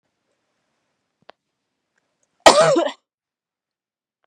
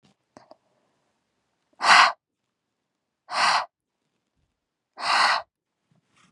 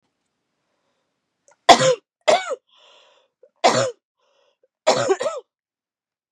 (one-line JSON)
{"cough_length": "4.3 s", "cough_amplitude": 32768, "cough_signal_mean_std_ratio": 0.23, "exhalation_length": "6.3 s", "exhalation_amplitude": 28975, "exhalation_signal_mean_std_ratio": 0.3, "three_cough_length": "6.3 s", "three_cough_amplitude": 32768, "three_cough_signal_mean_std_ratio": 0.3, "survey_phase": "beta (2021-08-13 to 2022-03-07)", "age": "18-44", "gender": "Female", "wearing_mask": "No", "symptom_cough_any": true, "symptom_fatigue": true, "symptom_headache": true, "symptom_onset": "4 days", "smoker_status": "Never smoked", "respiratory_condition_asthma": false, "respiratory_condition_other": false, "recruitment_source": "Test and Trace", "submission_delay": "3 days", "covid_test_result": "Positive", "covid_test_method": "RT-qPCR", "covid_ct_value": 30.6, "covid_ct_gene": "ORF1ab gene", "covid_ct_mean": 30.9, "covid_viral_load": "71 copies/ml", "covid_viral_load_category": "Minimal viral load (< 10K copies/ml)"}